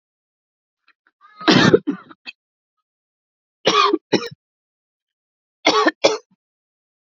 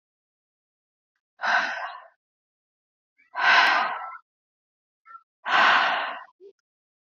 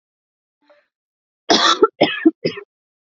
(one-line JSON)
{"three_cough_length": "7.1 s", "three_cough_amplitude": 31639, "three_cough_signal_mean_std_ratio": 0.31, "exhalation_length": "7.2 s", "exhalation_amplitude": 16047, "exhalation_signal_mean_std_ratio": 0.39, "cough_length": "3.1 s", "cough_amplitude": 27573, "cough_signal_mean_std_ratio": 0.34, "survey_phase": "alpha (2021-03-01 to 2021-08-12)", "age": "18-44", "gender": "Female", "wearing_mask": "No", "symptom_none": true, "smoker_status": "Current smoker (e-cigarettes or vapes only)", "respiratory_condition_asthma": false, "respiratory_condition_other": false, "recruitment_source": "REACT", "submission_delay": "1 day", "covid_test_result": "Negative", "covid_test_method": "RT-qPCR"}